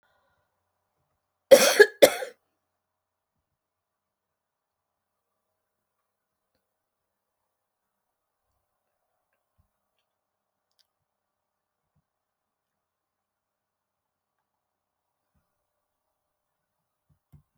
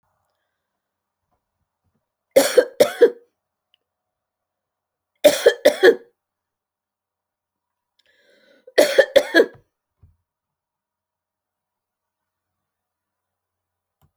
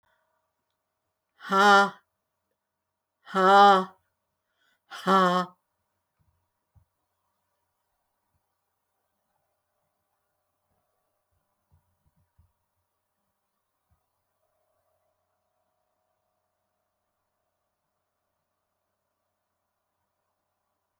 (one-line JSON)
{"cough_length": "17.6 s", "cough_amplitude": 28516, "cough_signal_mean_std_ratio": 0.11, "three_cough_length": "14.2 s", "three_cough_amplitude": 32768, "three_cough_signal_mean_std_ratio": 0.22, "exhalation_length": "21.0 s", "exhalation_amplitude": 18388, "exhalation_signal_mean_std_ratio": 0.2, "survey_phase": "alpha (2021-03-01 to 2021-08-12)", "age": "65+", "gender": "Female", "wearing_mask": "No", "symptom_none": true, "smoker_status": "Ex-smoker", "respiratory_condition_asthma": false, "respiratory_condition_other": false, "recruitment_source": "REACT", "submission_delay": "1 day", "covid_test_result": "Negative", "covid_test_method": "RT-qPCR"}